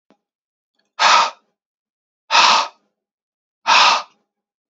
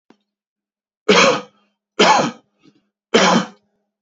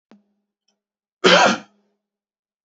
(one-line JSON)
{"exhalation_length": "4.7 s", "exhalation_amplitude": 30851, "exhalation_signal_mean_std_ratio": 0.37, "three_cough_length": "4.0 s", "three_cough_amplitude": 32686, "three_cough_signal_mean_std_ratio": 0.4, "cough_length": "2.6 s", "cough_amplitude": 28116, "cough_signal_mean_std_ratio": 0.28, "survey_phase": "beta (2021-08-13 to 2022-03-07)", "age": "18-44", "gender": "Male", "wearing_mask": "No", "symptom_none": true, "smoker_status": "Never smoked", "respiratory_condition_asthma": false, "respiratory_condition_other": false, "recruitment_source": "REACT", "submission_delay": "1 day", "covid_test_result": "Negative", "covid_test_method": "RT-qPCR", "influenza_a_test_result": "Negative", "influenza_b_test_result": "Negative"}